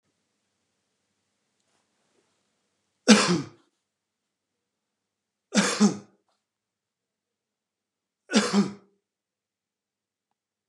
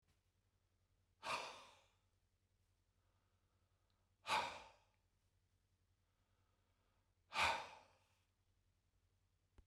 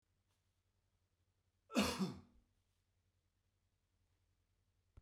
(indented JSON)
{
  "three_cough_length": "10.7 s",
  "three_cough_amplitude": 28615,
  "three_cough_signal_mean_std_ratio": 0.23,
  "exhalation_length": "9.7 s",
  "exhalation_amplitude": 1578,
  "exhalation_signal_mean_std_ratio": 0.25,
  "cough_length": "5.0 s",
  "cough_amplitude": 2183,
  "cough_signal_mean_std_ratio": 0.23,
  "survey_phase": "beta (2021-08-13 to 2022-03-07)",
  "age": "65+",
  "gender": "Male",
  "wearing_mask": "No",
  "symptom_headache": true,
  "symptom_onset": "6 days",
  "smoker_status": "Ex-smoker",
  "respiratory_condition_asthma": false,
  "respiratory_condition_other": false,
  "recruitment_source": "REACT",
  "submission_delay": "1 day",
  "covid_test_result": "Negative",
  "covid_test_method": "RT-qPCR",
  "influenza_a_test_result": "Negative",
  "influenza_b_test_result": "Negative"
}